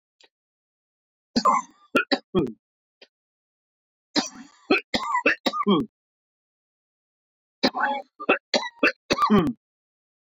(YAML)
three_cough_length: 10.3 s
three_cough_amplitude: 16491
three_cough_signal_mean_std_ratio: 0.38
survey_phase: beta (2021-08-13 to 2022-03-07)
age: 18-44
gender: Male
wearing_mask: 'No'
symptom_cough_any: true
symptom_runny_or_blocked_nose: true
symptom_sore_throat: true
symptom_fatigue: true
symptom_onset: 2 days
smoker_status: Current smoker (e-cigarettes or vapes only)
respiratory_condition_asthma: false
respiratory_condition_other: false
recruitment_source: Test and Trace
submission_delay: 1 day
covid_test_result: Positive
covid_test_method: RT-qPCR